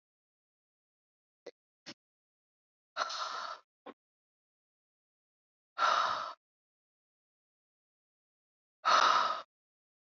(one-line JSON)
{"exhalation_length": "10.1 s", "exhalation_amplitude": 7142, "exhalation_signal_mean_std_ratio": 0.28, "survey_phase": "beta (2021-08-13 to 2022-03-07)", "age": "18-44", "gender": "Female", "wearing_mask": "No", "symptom_cough_any": true, "symptom_runny_or_blocked_nose": true, "symptom_fatigue": true, "symptom_onset": "2 days", "smoker_status": "Never smoked", "respiratory_condition_asthma": false, "respiratory_condition_other": false, "recruitment_source": "Test and Trace", "submission_delay": "2 days", "covid_test_result": "Positive", "covid_test_method": "RT-qPCR", "covid_ct_value": 18.2, "covid_ct_gene": "ORF1ab gene", "covid_ct_mean": 19.4, "covid_viral_load": "440000 copies/ml", "covid_viral_load_category": "Low viral load (10K-1M copies/ml)"}